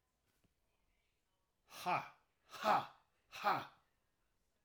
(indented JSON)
{
  "exhalation_length": "4.6 s",
  "exhalation_amplitude": 2810,
  "exhalation_signal_mean_std_ratio": 0.31,
  "survey_phase": "alpha (2021-03-01 to 2021-08-12)",
  "age": "45-64",
  "gender": "Male",
  "wearing_mask": "No",
  "symptom_none": true,
  "smoker_status": "Ex-smoker",
  "respiratory_condition_asthma": false,
  "respiratory_condition_other": false,
  "recruitment_source": "REACT",
  "submission_delay": "1 day",
  "covid_test_result": "Negative",
  "covid_test_method": "RT-qPCR"
}